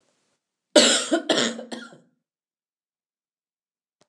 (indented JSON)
{
  "cough_length": "4.1 s",
  "cough_amplitude": 28344,
  "cough_signal_mean_std_ratio": 0.31,
  "survey_phase": "alpha (2021-03-01 to 2021-08-12)",
  "age": "45-64",
  "gender": "Female",
  "wearing_mask": "No",
  "symptom_none": true,
  "symptom_onset": "6 days",
  "smoker_status": "Never smoked",
  "respiratory_condition_asthma": false,
  "respiratory_condition_other": false,
  "recruitment_source": "REACT",
  "submission_delay": "1 day",
  "covid_test_result": "Negative",
  "covid_test_method": "RT-qPCR"
}